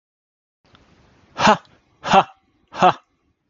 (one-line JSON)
{"exhalation_length": "3.5 s", "exhalation_amplitude": 30216, "exhalation_signal_mean_std_ratio": 0.29, "survey_phase": "alpha (2021-03-01 to 2021-08-12)", "age": "18-44", "gender": "Male", "wearing_mask": "No", "symptom_none": true, "smoker_status": "Ex-smoker", "respiratory_condition_asthma": false, "respiratory_condition_other": false, "recruitment_source": "REACT", "submission_delay": "2 days", "covid_test_result": "Negative", "covid_test_method": "RT-qPCR"}